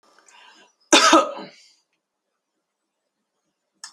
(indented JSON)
{
  "cough_length": "3.9 s",
  "cough_amplitude": 28859,
  "cough_signal_mean_std_ratio": 0.24,
  "survey_phase": "alpha (2021-03-01 to 2021-08-12)",
  "age": "65+",
  "gender": "Female",
  "wearing_mask": "No",
  "symptom_none": true,
  "smoker_status": "Never smoked",
  "respiratory_condition_asthma": false,
  "respiratory_condition_other": false,
  "recruitment_source": "REACT",
  "submission_delay": "2 days",
  "covid_test_result": "Negative",
  "covid_test_method": "RT-qPCR"
}